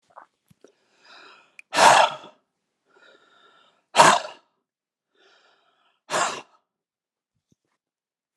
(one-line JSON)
{"exhalation_length": "8.4 s", "exhalation_amplitude": 32540, "exhalation_signal_mean_std_ratio": 0.24, "survey_phase": "alpha (2021-03-01 to 2021-08-12)", "age": "45-64", "gender": "Male", "wearing_mask": "No", "symptom_none": true, "smoker_status": "Never smoked", "respiratory_condition_asthma": false, "respiratory_condition_other": false, "recruitment_source": "REACT", "submission_delay": "2 days", "covid_test_result": "Negative", "covid_test_method": "RT-qPCR"}